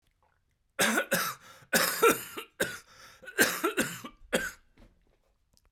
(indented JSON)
{
  "cough_length": "5.7 s",
  "cough_amplitude": 11240,
  "cough_signal_mean_std_ratio": 0.44,
  "survey_phase": "beta (2021-08-13 to 2022-03-07)",
  "age": "45-64",
  "gender": "Male",
  "wearing_mask": "No",
  "symptom_cough_any": true,
  "smoker_status": "Ex-smoker",
  "respiratory_condition_asthma": false,
  "respiratory_condition_other": false,
  "recruitment_source": "Test and Trace",
  "submission_delay": "2 days",
  "covid_test_result": "Positive",
  "covid_test_method": "LFT"
}